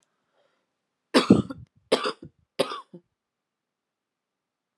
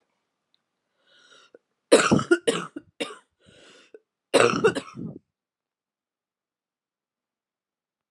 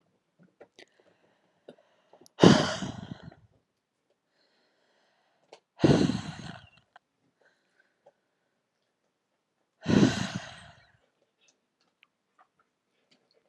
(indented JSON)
{
  "three_cough_length": "4.8 s",
  "three_cough_amplitude": 25121,
  "three_cough_signal_mean_std_ratio": 0.23,
  "cough_length": "8.1 s",
  "cough_amplitude": 29774,
  "cough_signal_mean_std_ratio": 0.26,
  "exhalation_length": "13.5 s",
  "exhalation_amplitude": 29880,
  "exhalation_signal_mean_std_ratio": 0.22,
  "survey_phase": "alpha (2021-03-01 to 2021-08-12)",
  "age": "18-44",
  "gender": "Female",
  "wearing_mask": "No",
  "symptom_cough_any": true,
  "symptom_new_continuous_cough": true,
  "symptom_shortness_of_breath": true,
  "symptom_fatigue": true,
  "symptom_fever_high_temperature": true,
  "symptom_headache": true,
  "symptom_change_to_sense_of_smell_or_taste": true,
  "symptom_loss_of_taste": true,
  "symptom_onset": "4 days",
  "smoker_status": "Ex-smoker",
  "respiratory_condition_asthma": false,
  "respiratory_condition_other": false,
  "recruitment_source": "Test and Trace",
  "submission_delay": "2 days",
  "covid_test_result": "Positive",
  "covid_test_method": "RT-qPCR"
}